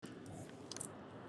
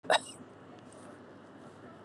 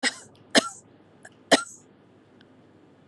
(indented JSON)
{
  "exhalation_length": "1.3 s",
  "exhalation_amplitude": 2007,
  "exhalation_signal_mean_std_ratio": 1.02,
  "cough_length": "2.0 s",
  "cough_amplitude": 6633,
  "cough_signal_mean_std_ratio": 0.34,
  "three_cough_length": "3.1 s",
  "three_cough_amplitude": 26335,
  "three_cough_signal_mean_std_ratio": 0.24,
  "survey_phase": "beta (2021-08-13 to 2022-03-07)",
  "age": "45-64",
  "gender": "Female",
  "wearing_mask": "No",
  "symptom_none": true,
  "smoker_status": "Never smoked",
  "respiratory_condition_asthma": false,
  "respiratory_condition_other": false,
  "recruitment_source": "REACT",
  "submission_delay": "1 day",
  "covid_test_result": "Negative",
  "covid_test_method": "RT-qPCR",
  "influenza_a_test_result": "Unknown/Void",
  "influenza_b_test_result": "Unknown/Void"
}